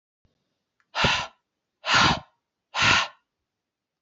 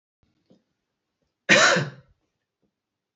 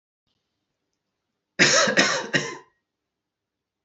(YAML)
exhalation_length: 4.0 s
exhalation_amplitude: 19572
exhalation_signal_mean_std_ratio: 0.38
cough_length: 3.2 s
cough_amplitude: 26081
cough_signal_mean_std_ratio: 0.27
three_cough_length: 3.8 s
three_cough_amplitude: 23811
three_cough_signal_mean_std_ratio: 0.35
survey_phase: alpha (2021-03-01 to 2021-08-12)
age: 18-44
gender: Male
wearing_mask: 'No'
symptom_none: true
smoker_status: Never smoked
respiratory_condition_asthma: false
respiratory_condition_other: false
recruitment_source: REACT
submission_delay: 3 days
covid_test_result: Negative
covid_test_method: RT-qPCR